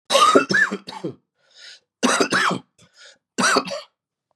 three_cough_length: 4.4 s
three_cough_amplitude: 29636
three_cough_signal_mean_std_ratio: 0.49
survey_phase: beta (2021-08-13 to 2022-03-07)
age: 45-64
gender: Male
wearing_mask: 'No'
symptom_cough_any: true
symptom_sore_throat: true
symptom_headache: true
symptom_loss_of_taste: true
symptom_onset: 6 days
smoker_status: Never smoked
respiratory_condition_asthma: false
respiratory_condition_other: false
recruitment_source: Test and Trace
submission_delay: 3 days
covid_test_result: Positive
covid_test_method: RT-qPCR
covid_ct_value: 25.9
covid_ct_gene: S gene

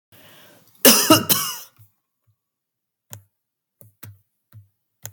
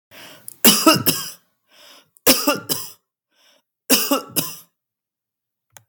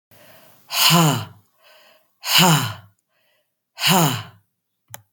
cough_length: 5.1 s
cough_amplitude: 32768
cough_signal_mean_std_ratio: 0.25
three_cough_length: 5.9 s
three_cough_amplitude: 32768
three_cough_signal_mean_std_ratio: 0.36
exhalation_length: 5.1 s
exhalation_amplitude: 32767
exhalation_signal_mean_std_ratio: 0.43
survey_phase: beta (2021-08-13 to 2022-03-07)
age: 45-64
gender: Female
wearing_mask: 'No'
symptom_cough_any: true
symptom_runny_or_blocked_nose: true
symptom_onset: 3 days
smoker_status: Never smoked
respiratory_condition_asthma: false
respiratory_condition_other: false
recruitment_source: REACT
submission_delay: 1 day
covid_test_result: Negative
covid_test_method: RT-qPCR
influenza_a_test_result: Negative
influenza_b_test_result: Negative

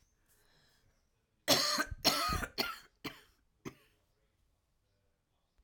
three_cough_length: 5.6 s
three_cough_amplitude: 7972
three_cough_signal_mean_std_ratio: 0.34
survey_phase: alpha (2021-03-01 to 2021-08-12)
age: 45-64
gender: Female
wearing_mask: 'No'
symptom_cough_any: true
symptom_shortness_of_breath: true
symptom_fatigue: true
symptom_fever_high_temperature: true
symptom_headache: true
symptom_change_to_sense_of_smell_or_taste: true
symptom_loss_of_taste: true
symptom_onset: 2 days
smoker_status: Never smoked
respiratory_condition_asthma: false
respiratory_condition_other: false
recruitment_source: Test and Trace
submission_delay: 2 days
covid_test_result: Positive
covid_test_method: RT-qPCR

